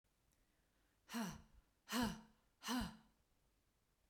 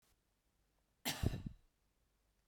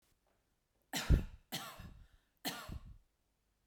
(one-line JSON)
{"exhalation_length": "4.1 s", "exhalation_amplitude": 1238, "exhalation_signal_mean_std_ratio": 0.38, "cough_length": "2.5 s", "cough_amplitude": 2701, "cough_signal_mean_std_ratio": 0.29, "three_cough_length": "3.7 s", "three_cough_amplitude": 5978, "three_cough_signal_mean_std_ratio": 0.29, "survey_phase": "beta (2021-08-13 to 2022-03-07)", "age": "18-44", "gender": "Female", "wearing_mask": "No", "symptom_none": true, "smoker_status": "Never smoked", "respiratory_condition_asthma": false, "respiratory_condition_other": false, "recruitment_source": "REACT", "submission_delay": "2 days", "covid_test_result": "Negative", "covid_test_method": "RT-qPCR"}